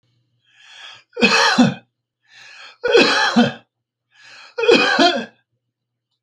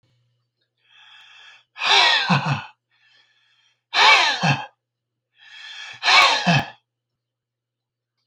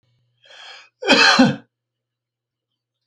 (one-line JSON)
{"three_cough_length": "6.2 s", "three_cough_amplitude": 32767, "three_cough_signal_mean_std_ratio": 0.45, "exhalation_length": "8.3 s", "exhalation_amplitude": 29815, "exhalation_signal_mean_std_ratio": 0.4, "cough_length": "3.1 s", "cough_amplitude": 29672, "cough_signal_mean_std_ratio": 0.33, "survey_phase": "beta (2021-08-13 to 2022-03-07)", "age": "65+", "gender": "Male", "wearing_mask": "No", "symptom_none": true, "smoker_status": "Never smoked", "respiratory_condition_asthma": false, "respiratory_condition_other": false, "recruitment_source": "REACT", "submission_delay": "2 days", "covid_test_result": "Negative", "covid_test_method": "RT-qPCR"}